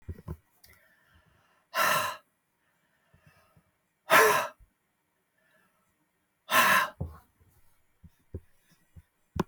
{
  "exhalation_length": "9.5 s",
  "exhalation_amplitude": 14282,
  "exhalation_signal_mean_std_ratio": 0.29,
  "survey_phase": "beta (2021-08-13 to 2022-03-07)",
  "age": "45-64",
  "gender": "Female",
  "wearing_mask": "No",
  "symptom_sore_throat": true,
  "smoker_status": "Never smoked",
  "respiratory_condition_asthma": false,
  "respiratory_condition_other": false,
  "recruitment_source": "Test and Trace",
  "submission_delay": "0 days",
  "covid_test_result": "Negative",
  "covid_test_method": "LFT"
}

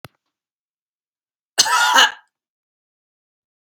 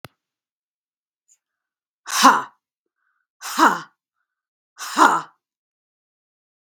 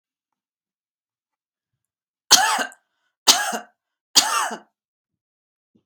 {
  "cough_length": "3.7 s",
  "cough_amplitude": 32768,
  "cough_signal_mean_std_ratio": 0.29,
  "exhalation_length": "6.7 s",
  "exhalation_amplitude": 32768,
  "exhalation_signal_mean_std_ratio": 0.26,
  "three_cough_length": "5.9 s",
  "three_cough_amplitude": 32768,
  "three_cough_signal_mean_std_ratio": 0.28,
  "survey_phase": "beta (2021-08-13 to 2022-03-07)",
  "age": "45-64",
  "gender": "Female",
  "wearing_mask": "No",
  "symptom_sore_throat": true,
  "symptom_fatigue": true,
  "symptom_onset": "3 days",
  "smoker_status": "Never smoked",
  "respiratory_condition_asthma": false,
  "respiratory_condition_other": false,
  "recruitment_source": "Test and Trace",
  "submission_delay": "0 days",
  "covid_test_result": "Negative",
  "covid_test_method": "RT-qPCR"
}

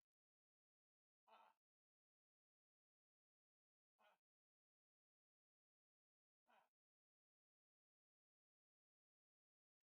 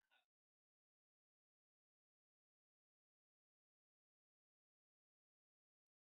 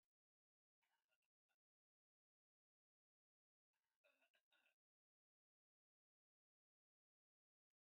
{
  "exhalation_length": "9.9 s",
  "exhalation_amplitude": 41,
  "exhalation_signal_mean_std_ratio": 0.17,
  "cough_length": "6.0 s",
  "cough_amplitude": 17,
  "cough_signal_mean_std_ratio": 0.11,
  "three_cough_length": "7.9 s",
  "three_cough_amplitude": 14,
  "three_cough_signal_mean_std_ratio": 0.21,
  "survey_phase": "beta (2021-08-13 to 2022-03-07)",
  "age": "65+",
  "gender": "Male",
  "wearing_mask": "No",
  "symptom_shortness_of_breath": true,
  "symptom_headache": true,
  "smoker_status": "Ex-smoker",
  "respiratory_condition_asthma": true,
  "respiratory_condition_other": true,
  "recruitment_source": "REACT",
  "submission_delay": "5 days",
  "covid_test_result": "Negative",
  "covid_test_method": "RT-qPCR"
}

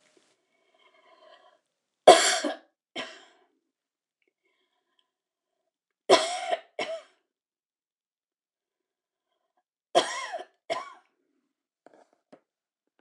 {
  "three_cough_length": "13.0 s",
  "three_cough_amplitude": 26027,
  "three_cough_signal_mean_std_ratio": 0.2,
  "survey_phase": "alpha (2021-03-01 to 2021-08-12)",
  "age": "65+",
  "gender": "Female",
  "wearing_mask": "No",
  "symptom_none": true,
  "smoker_status": "Never smoked",
  "respiratory_condition_asthma": false,
  "respiratory_condition_other": false,
  "recruitment_source": "REACT",
  "submission_delay": "1 day",
  "covid_test_result": "Negative",
  "covid_test_method": "RT-qPCR"
}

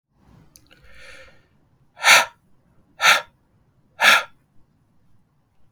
{
  "exhalation_length": "5.7 s",
  "exhalation_amplitude": 32768,
  "exhalation_signal_mean_std_ratio": 0.27,
  "survey_phase": "beta (2021-08-13 to 2022-03-07)",
  "age": "18-44",
  "gender": "Male",
  "wearing_mask": "No",
  "symptom_none": true,
  "smoker_status": "Never smoked",
  "respiratory_condition_asthma": false,
  "respiratory_condition_other": false,
  "recruitment_source": "REACT",
  "submission_delay": "1 day",
  "covid_test_result": "Negative",
  "covid_test_method": "RT-qPCR",
  "influenza_a_test_result": "Negative",
  "influenza_b_test_result": "Negative"
}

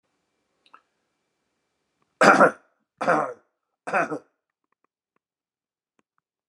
{
  "three_cough_length": "6.5 s",
  "three_cough_amplitude": 32669,
  "three_cough_signal_mean_std_ratio": 0.24,
  "survey_phase": "beta (2021-08-13 to 2022-03-07)",
  "age": "45-64",
  "gender": "Male",
  "wearing_mask": "No",
  "symptom_cough_any": true,
  "symptom_sore_throat": true,
  "symptom_headache": true,
  "symptom_onset": "8 days",
  "smoker_status": "Never smoked",
  "respiratory_condition_asthma": false,
  "respiratory_condition_other": false,
  "recruitment_source": "Test and Trace",
  "submission_delay": "1 day",
  "covid_test_result": "Positive",
  "covid_test_method": "RT-qPCR",
  "covid_ct_value": 16.1,
  "covid_ct_gene": "ORF1ab gene"
}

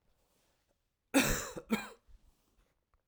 {
  "cough_length": "3.1 s",
  "cough_amplitude": 6856,
  "cough_signal_mean_std_ratio": 0.3,
  "survey_phase": "alpha (2021-03-01 to 2021-08-12)",
  "age": "45-64",
  "gender": "Male",
  "wearing_mask": "No",
  "symptom_cough_any": true,
  "symptom_fever_high_temperature": true,
  "symptom_headache": true,
  "symptom_onset": "3 days",
  "smoker_status": "Never smoked",
  "respiratory_condition_asthma": false,
  "respiratory_condition_other": false,
  "recruitment_source": "Test and Trace",
  "submission_delay": "1 day",
  "covid_test_result": "Positive",
  "covid_test_method": "RT-qPCR",
  "covid_ct_value": 18.1,
  "covid_ct_gene": "ORF1ab gene"
}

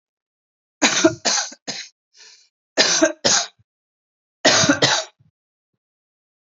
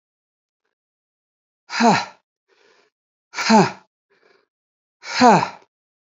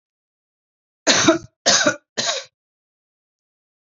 {
  "three_cough_length": "6.6 s",
  "three_cough_amplitude": 32218,
  "three_cough_signal_mean_std_ratio": 0.39,
  "exhalation_length": "6.1 s",
  "exhalation_amplitude": 29152,
  "exhalation_signal_mean_std_ratio": 0.3,
  "cough_length": "3.9 s",
  "cough_amplitude": 29686,
  "cough_signal_mean_std_ratio": 0.34,
  "survey_phase": "beta (2021-08-13 to 2022-03-07)",
  "age": "45-64",
  "gender": "Female",
  "wearing_mask": "No",
  "symptom_cough_any": true,
  "symptom_runny_or_blocked_nose": true,
  "symptom_sore_throat": true,
  "symptom_fatigue": true,
  "symptom_headache": true,
  "symptom_onset": "3 days",
  "smoker_status": "Current smoker (e-cigarettes or vapes only)",
  "respiratory_condition_asthma": false,
  "respiratory_condition_other": false,
  "recruitment_source": "Test and Trace",
  "submission_delay": "1 day",
  "covid_test_result": "Positive",
  "covid_test_method": "RT-qPCR",
  "covid_ct_value": 21.9,
  "covid_ct_gene": "ORF1ab gene"
}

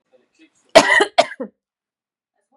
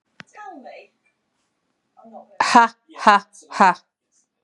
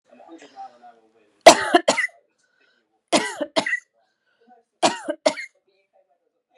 {
  "cough_length": "2.6 s",
  "cough_amplitude": 32768,
  "cough_signal_mean_std_ratio": 0.28,
  "exhalation_length": "4.4 s",
  "exhalation_amplitude": 32767,
  "exhalation_signal_mean_std_ratio": 0.29,
  "three_cough_length": "6.6 s",
  "three_cough_amplitude": 32768,
  "three_cough_signal_mean_std_ratio": 0.26,
  "survey_phase": "beta (2021-08-13 to 2022-03-07)",
  "age": "45-64",
  "gender": "Female",
  "wearing_mask": "No",
  "symptom_runny_or_blocked_nose": true,
  "symptom_loss_of_taste": true,
  "smoker_status": "Ex-smoker",
  "respiratory_condition_asthma": false,
  "respiratory_condition_other": false,
  "recruitment_source": "Test and Trace",
  "submission_delay": "2 days",
  "covid_test_result": "Positive",
  "covid_test_method": "LAMP"
}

